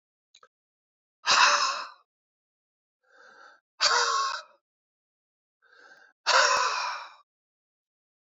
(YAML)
exhalation_length: 8.3 s
exhalation_amplitude: 17731
exhalation_signal_mean_std_ratio: 0.37
survey_phase: beta (2021-08-13 to 2022-03-07)
age: 45-64
gender: Male
wearing_mask: 'No'
symptom_none: true
smoker_status: Current smoker (11 or more cigarettes per day)
respiratory_condition_asthma: true
respiratory_condition_other: true
recruitment_source: REACT
submission_delay: 1 day
covid_test_result: Negative
covid_test_method: RT-qPCR
influenza_a_test_result: Negative
influenza_b_test_result: Negative